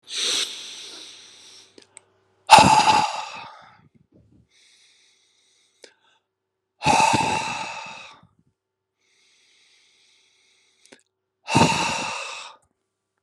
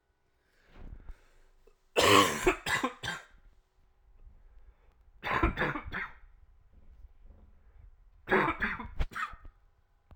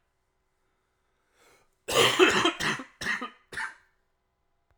{"exhalation_length": "13.2 s", "exhalation_amplitude": 32768, "exhalation_signal_mean_std_ratio": 0.33, "three_cough_length": "10.2 s", "three_cough_amplitude": 15333, "three_cough_signal_mean_std_ratio": 0.38, "cough_length": "4.8 s", "cough_amplitude": 16107, "cough_signal_mean_std_ratio": 0.37, "survey_phase": "alpha (2021-03-01 to 2021-08-12)", "age": "18-44", "gender": "Male", "wearing_mask": "No", "symptom_cough_any": true, "symptom_new_continuous_cough": true, "symptom_fatigue": true, "symptom_fever_high_temperature": true, "symptom_headache": true, "symptom_onset": "2 days", "smoker_status": "Never smoked", "respiratory_condition_asthma": false, "respiratory_condition_other": false, "recruitment_source": "Test and Trace", "submission_delay": "1 day", "covid_test_result": "Positive", "covid_test_method": "RT-qPCR", "covid_ct_value": 30.2, "covid_ct_gene": "ORF1ab gene", "covid_ct_mean": 31.2, "covid_viral_load": "58 copies/ml", "covid_viral_load_category": "Minimal viral load (< 10K copies/ml)"}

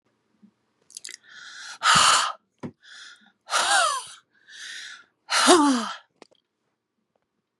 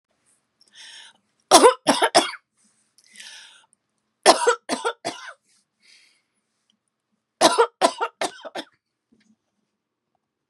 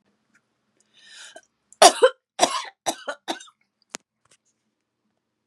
{"exhalation_length": "7.6 s", "exhalation_amplitude": 28187, "exhalation_signal_mean_std_ratio": 0.4, "three_cough_length": "10.5 s", "three_cough_amplitude": 32767, "three_cough_signal_mean_std_ratio": 0.27, "cough_length": "5.5 s", "cough_amplitude": 32768, "cough_signal_mean_std_ratio": 0.21, "survey_phase": "beta (2021-08-13 to 2022-03-07)", "age": "45-64", "gender": "Female", "wearing_mask": "No", "symptom_sore_throat": true, "smoker_status": "Never smoked", "respiratory_condition_asthma": false, "respiratory_condition_other": false, "recruitment_source": "REACT", "submission_delay": "3 days", "covid_test_result": "Negative", "covid_test_method": "RT-qPCR"}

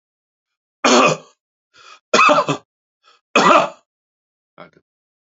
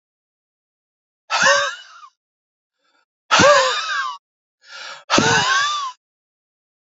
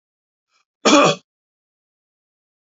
{"three_cough_length": "5.2 s", "three_cough_amplitude": 32618, "three_cough_signal_mean_std_ratio": 0.36, "exhalation_length": "6.9 s", "exhalation_amplitude": 30071, "exhalation_signal_mean_std_ratio": 0.43, "cough_length": "2.7 s", "cough_amplitude": 28891, "cough_signal_mean_std_ratio": 0.26, "survey_phase": "alpha (2021-03-01 to 2021-08-12)", "age": "65+", "gender": "Male", "wearing_mask": "No", "symptom_none": true, "smoker_status": "Never smoked", "respiratory_condition_asthma": false, "respiratory_condition_other": false, "recruitment_source": "REACT", "submission_delay": "5 days", "covid_test_result": "Negative", "covid_test_method": "RT-qPCR"}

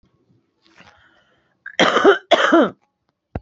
{"cough_length": "3.4 s", "cough_amplitude": 29244, "cough_signal_mean_std_ratio": 0.37, "survey_phase": "beta (2021-08-13 to 2022-03-07)", "age": "18-44", "gender": "Female", "wearing_mask": "No", "symptom_cough_any": true, "symptom_abdominal_pain": true, "symptom_headache": true, "symptom_onset": "12 days", "smoker_status": "Current smoker (1 to 10 cigarettes per day)", "respiratory_condition_asthma": true, "respiratory_condition_other": false, "recruitment_source": "REACT", "submission_delay": "2 days", "covid_test_result": "Negative", "covid_test_method": "RT-qPCR", "influenza_a_test_result": "Negative", "influenza_b_test_result": "Negative"}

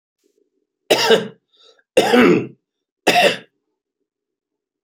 {"three_cough_length": "4.8 s", "three_cough_amplitude": 32767, "three_cough_signal_mean_std_ratio": 0.38, "survey_phase": "beta (2021-08-13 to 2022-03-07)", "age": "45-64", "gender": "Male", "wearing_mask": "No", "symptom_none": true, "smoker_status": "Never smoked", "respiratory_condition_asthma": false, "respiratory_condition_other": false, "recruitment_source": "REACT", "submission_delay": "1 day", "covid_test_result": "Negative", "covid_test_method": "RT-qPCR", "influenza_a_test_result": "Negative", "influenza_b_test_result": "Negative"}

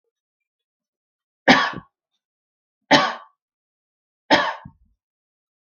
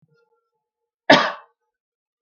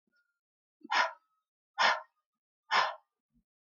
{"three_cough_length": "5.7 s", "three_cough_amplitude": 32768, "three_cough_signal_mean_std_ratio": 0.25, "cough_length": "2.2 s", "cough_amplitude": 32768, "cough_signal_mean_std_ratio": 0.22, "exhalation_length": "3.7 s", "exhalation_amplitude": 7306, "exhalation_signal_mean_std_ratio": 0.32, "survey_phase": "beta (2021-08-13 to 2022-03-07)", "age": "18-44", "gender": "Female", "wearing_mask": "No", "symptom_cough_any": true, "symptom_sore_throat": true, "symptom_fatigue": true, "symptom_onset": "8 days", "smoker_status": "Current smoker (e-cigarettes or vapes only)", "respiratory_condition_asthma": false, "respiratory_condition_other": false, "recruitment_source": "REACT", "submission_delay": "1 day", "covid_test_result": "Negative", "covid_test_method": "RT-qPCR"}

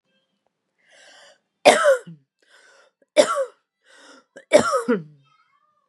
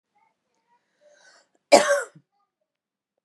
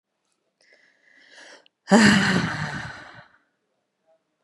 {"three_cough_length": "5.9 s", "three_cough_amplitude": 32768, "three_cough_signal_mean_std_ratio": 0.31, "cough_length": "3.2 s", "cough_amplitude": 30425, "cough_signal_mean_std_ratio": 0.21, "exhalation_length": "4.4 s", "exhalation_amplitude": 30957, "exhalation_signal_mean_std_ratio": 0.33, "survey_phase": "beta (2021-08-13 to 2022-03-07)", "age": "18-44", "gender": "Female", "wearing_mask": "No", "symptom_sore_throat": true, "symptom_onset": "12 days", "smoker_status": "Ex-smoker", "respiratory_condition_asthma": false, "respiratory_condition_other": false, "recruitment_source": "REACT", "submission_delay": "1 day", "covid_test_result": "Positive", "covid_test_method": "RT-qPCR", "covid_ct_value": 36.0, "covid_ct_gene": "N gene", "influenza_a_test_result": "Negative", "influenza_b_test_result": "Negative"}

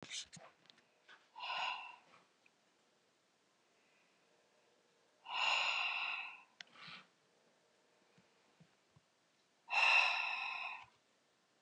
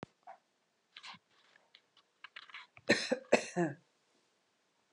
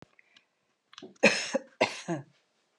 {"exhalation_length": "11.6 s", "exhalation_amplitude": 4028, "exhalation_signal_mean_std_ratio": 0.38, "three_cough_length": "4.9 s", "three_cough_amplitude": 9148, "three_cough_signal_mean_std_ratio": 0.26, "cough_length": "2.8 s", "cough_amplitude": 14535, "cough_signal_mean_std_ratio": 0.31, "survey_phase": "alpha (2021-03-01 to 2021-08-12)", "age": "65+", "gender": "Female", "wearing_mask": "No", "symptom_none": true, "symptom_onset": "13 days", "smoker_status": "Never smoked", "respiratory_condition_asthma": true, "respiratory_condition_other": false, "recruitment_source": "REACT", "submission_delay": "1 day", "covid_test_result": "Negative", "covid_test_method": "RT-qPCR"}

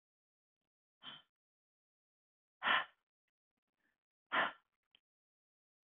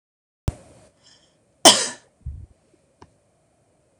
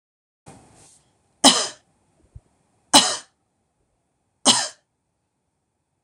{"exhalation_length": "5.9 s", "exhalation_amplitude": 3753, "exhalation_signal_mean_std_ratio": 0.21, "cough_length": "4.0 s", "cough_amplitude": 26028, "cough_signal_mean_std_ratio": 0.19, "three_cough_length": "6.0 s", "three_cough_amplitude": 26028, "three_cough_signal_mean_std_ratio": 0.23, "survey_phase": "beta (2021-08-13 to 2022-03-07)", "age": "45-64", "gender": "Female", "wearing_mask": "No", "symptom_none": true, "smoker_status": "Ex-smoker", "respiratory_condition_asthma": false, "respiratory_condition_other": false, "recruitment_source": "REACT", "submission_delay": "2 days", "covid_test_result": "Negative", "covid_test_method": "RT-qPCR"}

